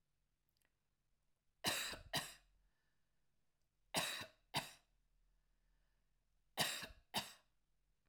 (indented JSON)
{
  "three_cough_length": "8.1 s",
  "three_cough_amplitude": 2254,
  "three_cough_signal_mean_std_ratio": 0.33,
  "survey_phase": "alpha (2021-03-01 to 2021-08-12)",
  "age": "65+",
  "gender": "Female",
  "wearing_mask": "No",
  "symptom_none": true,
  "smoker_status": "Never smoked",
  "respiratory_condition_asthma": false,
  "respiratory_condition_other": false,
  "recruitment_source": "REACT",
  "submission_delay": "1 day",
  "covid_test_result": "Negative",
  "covid_test_method": "RT-qPCR"
}